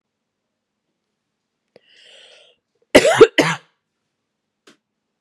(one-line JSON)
{"cough_length": "5.2 s", "cough_amplitude": 32768, "cough_signal_mean_std_ratio": 0.21, "survey_phase": "beta (2021-08-13 to 2022-03-07)", "age": "45-64", "gender": "Female", "wearing_mask": "No", "symptom_cough_any": true, "symptom_runny_or_blocked_nose": true, "symptom_sore_throat": true, "symptom_fatigue": true, "symptom_headache": true, "symptom_other": true, "symptom_onset": "4 days", "smoker_status": "Never smoked", "respiratory_condition_asthma": false, "respiratory_condition_other": false, "recruitment_source": "Test and Trace", "submission_delay": "2 days", "covid_test_result": "Positive", "covid_test_method": "RT-qPCR", "covid_ct_value": 29.8, "covid_ct_gene": "ORF1ab gene", "covid_ct_mean": 30.3, "covid_viral_load": "120 copies/ml", "covid_viral_load_category": "Minimal viral load (< 10K copies/ml)"}